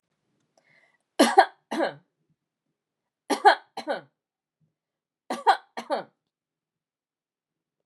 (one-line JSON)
{"three_cough_length": "7.9 s", "three_cough_amplitude": 27915, "three_cough_signal_mean_std_ratio": 0.24, "survey_phase": "beta (2021-08-13 to 2022-03-07)", "age": "45-64", "gender": "Female", "wearing_mask": "No", "symptom_headache": true, "smoker_status": "Never smoked", "respiratory_condition_asthma": false, "respiratory_condition_other": false, "recruitment_source": "Test and Trace", "submission_delay": "1 day", "covid_test_result": "Positive", "covid_test_method": "RT-qPCR"}